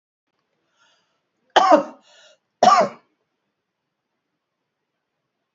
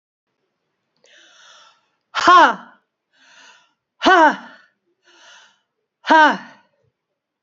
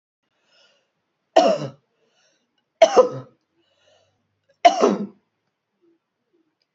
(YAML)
cough_length: 5.5 s
cough_amplitude: 29054
cough_signal_mean_std_ratio: 0.24
exhalation_length: 7.4 s
exhalation_amplitude: 28450
exhalation_signal_mean_std_ratio: 0.28
three_cough_length: 6.7 s
three_cough_amplitude: 28252
three_cough_signal_mean_std_ratio: 0.26
survey_phase: alpha (2021-03-01 to 2021-08-12)
age: 65+
gender: Female
wearing_mask: 'No'
symptom_none: true
smoker_status: Never smoked
respiratory_condition_asthma: false
respiratory_condition_other: false
recruitment_source: REACT
submission_delay: 1 day
covid_test_result: Negative
covid_test_method: RT-qPCR